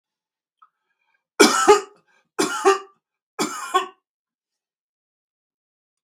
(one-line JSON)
{"three_cough_length": "6.0 s", "three_cough_amplitude": 32768, "three_cough_signal_mean_std_ratio": 0.29, "survey_phase": "beta (2021-08-13 to 2022-03-07)", "age": "65+", "gender": "Male", "wearing_mask": "No", "symptom_none": true, "smoker_status": "Never smoked", "respiratory_condition_asthma": false, "respiratory_condition_other": false, "recruitment_source": "REACT", "submission_delay": "3 days", "covid_test_result": "Negative", "covid_test_method": "RT-qPCR"}